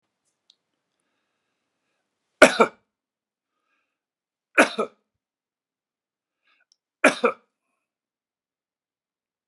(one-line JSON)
{"three_cough_length": "9.5 s", "three_cough_amplitude": 32768, "three_cough_signal_mean_std_ratio": 0.16, "survey_phase": "beta (2021-08-13 to 2022-03-07)", "age": "65+", "gender": "Male", "wearing_mask": "No", "symptom_none": true, "smoker_status": "Ex-smoker", "respiratory_condition_asthma": false, "respiratory_condition_other": false, "recruitment_source": "REACT", "submission_delay": "1 day", "covid_test_result": "Negative", "covid_test_method": "RT-qPCR"}